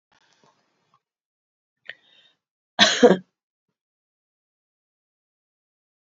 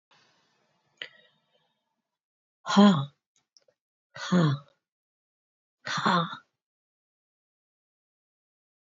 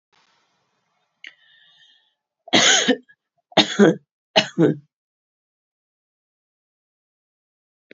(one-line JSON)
{"cough_length": "6.1 s", "cough_amplitude": 32767, "cough_signal_mean_std_ratio": 0.17, "exhalation_length": "9.0 s", "exhalation_amplitude": 14734, "exhalation_signal_mean_std_ratio": 0.26, "three_cough_length": "7.9 s", "three_cough_amplitude": 28723, "three_cough_signal_mean_std_ratio": 0.27, "survey_phase": "beta (2021-08-13 to 2022-03-07)", "age": "65+", "gender": "Female", "wearing_mask": "No", "symptom_fatigue": true, "smoker_status": "Never smoked", "respiratory_condition_asthma": false, "respiratory_condition_other": false, "recruitment_source": "REACT", "submission_delay": "2 days", "covid_test_result": "Negative", "covid_test_method": "RT-qPCR"}